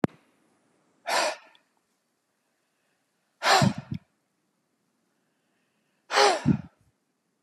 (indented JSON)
{
  "exhalation_length": "7.4 s",
  "exhalation_amplitude": 16658,
  "exhalation_signal_mean_std_ratio": 0.29,
  "survey_phase": "beta (2021-08-13 to 2022-03-07)",
  "age": "45-64",
  "gender": "Male",
  "wearing_mask": "No",
  "symptom_none": true,
  "smoker_status": "Never smoked",
  "respiratory_condition_asthma": false,
  "respiratory_condition_other": false,
  "recruitment_source": "REACT",
  "submission_delay": "1 day",
  "covid_test_result": "Negative",
  "covid_test_method": "RT-qPCR"
}